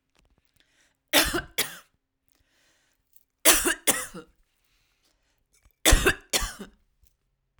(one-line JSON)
{"three_cough_length": "7.6 s", "three_cough_amplitude": 31505, "three_cough_signal_mean_std_ratio": 0.29, "survey_phase": "alpha (2021-03-01 to 2021-08-12)", "age": "45-64", "gender": "Female", "wearing_mask": "No", "symptom_none": true, "smoker_status": "Never smoked", "respiratory_condition_asthma": false, "respiratory_condition_other": false, "recruitment_source": "REACT", "submission_delay": "3 days", "covid_test_result": "Negative", "covid_test_method": "RT-qPCR"}